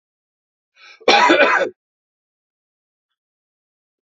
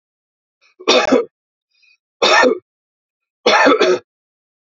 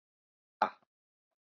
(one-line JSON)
{"cough_length": "4.0 s", "cough_amplitude": 30943, "cough_signal_mean_std_ratio": 0.31, "three_cough_length": "4.6 s", "three_cough_amplitude": 32768, "three_cough_signal_mean_std_ratio": 0.43, "exhalation_length": "1.5 s", "exhalation_amplitude": 7932, "exhalation_signal_mean_std_ratio": 0.14, "survey_phase": "beta (2021-08-13 to 2022-03-07)", "age": "45-64", "gender": "Male", "wearing_mask": "No", "symptom_none": true, "smoker_status": "Never smoked", "respiratory_condition_asthma": true, "respiratory_condition_other": false, "recruitment_source": "REACT", "submission_delay": "1 day", "covid_test_result": "Negative", "covid_test_method": "RT-qPCR"}